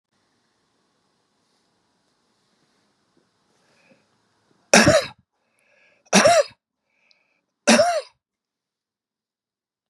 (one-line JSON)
{"three_cough_length": "9.9 s", "three_cough_amplitude": 32711, "three_cough_signal_mean_std_ratio": 0.25, "survey_phase": "beta (2021-08-13 to 2022-03-07)", "age": "65+", "gender": "Male", "wearing_mask": "No", "symptom_none": true, "smoker_status": "Never smoked", "respiratory_condition_asthma": false, "respiratory_condition_other": false, "recruitment_source": "REACT", "submission_delay": "2 days", "covid_test_result": "Negative", "covid_test_method": "RT-qPCR", "influenza_a_test_result": "Negative", "influenza_b_test_result": "Negative"}